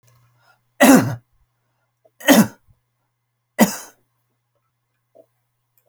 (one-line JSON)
{"three_cough_length": "5.9 s", "three_cough_amplitude": 32768, "three_cough_signal_mean_std_ratio": 0.26, "survey_phase": "alpha (2021-03-01 to 2021-08-12)", "age": "65+", "gender": "Male", "wearing_mask": "No", "symptom_none": true, "smoker_status": "Never smoked", "respiratory_condition_asthma": false, "respiratory_condition_other": false, "recruitment_source": "REACT", "submission_delay": "1 day", "covid_test_result": "Negative", "covid_test_method": "RT-qPCR"}